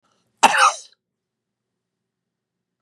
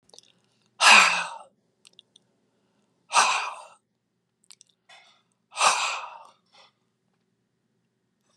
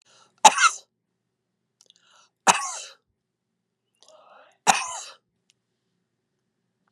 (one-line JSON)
{"cough_length": "2.8 s", "cough_amplitude": 32767, "cough_signal_mean_std_ratio": 0.24, "exhalation_length": "8.4 s", "exhalation_amplitude": 27417, "exhalation_signal_mean_std_ratio": 0.28, "three_cough_length": "6.9 s", "three_cough_amplitude": 32362, "three_cough_signal_mean_std_ratio": 0.2, "survey_phase": "beta (2021-08-13 to 2022-03-07)", "age": "65+", "gender": "Female", "wearing_mask": "No", "symptom_none": true, "smoker_status": "Ex-smoker", "respiratory_condition_asthma": false, "respiratory_condition_other": false, "recruitment_source": "REACT", "submission_delay": "2 days", "covid_test_result": "Negative", "covid_test_method": "RT-qPCR", "influenza_a_test_result": "Negative", "influenza_b_test_result": "Negative"}